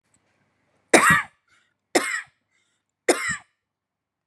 {"three_cough_length": "4.3 s", "three_cough_amplitude": 32534, "three_cough_signal_mean_std_ratio": 0.29, "survey_phase": "beta (2021-08-13 to 2022-03-07)", "age": "18-44", "gender": "Female", "wearing_mask": "No", "symptom_none": true, "smoker_status": "Never smoked", "respiratory_condition_asthma": false, "respiratory_condition_other": false, "recruitment_source": "Test and Trace", "submission_delay": "1 day", "covid_test_result": "Negative", "covid_test_method": "RT-qPCR"}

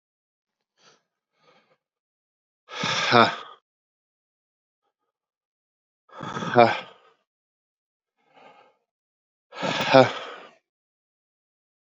{"exhalation_length": "11.9 s", "exhalation_amplitude": 29383, "exhalation_signal_mean_std_ratio": 0.23, "survey_phase": "beta (2021-08-13 to 2022-03-07)", "age": "45-64", "gender": "Male", "wearing_mask": "No", "symptom_cough_any": true, "smoker_status": "Never smoked", "respiratory_condition_asthma": false, "respiratory_condition_other": false, "recruitment_source": "Test and Trace", "submission_delay": "2 days", "covid_test_result": "Positive", "covid_test_method": "RT-qPCR"}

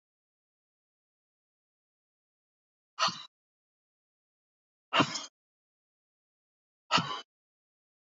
{"exhalation_length": "8.1 s", "exhalation_amplitude": 9631, "exhalation_signal_mean_std_ratio": 0.2, "survey_phase": "alpha (2021-03-01 to 2021-08-12)", "age": "45-64", "gender": "Female", "wearing_mask": "No", "symptom_none": true, "smoker_status": "Ex-smoker", "respiratory_condition_asthma": false, "respiratory_condition_other": false, "recruitment_source": "REACT", "submission_delay": "2 days", "covid_test_result": "Negative", "covid_test_method": "RT-qPCR"}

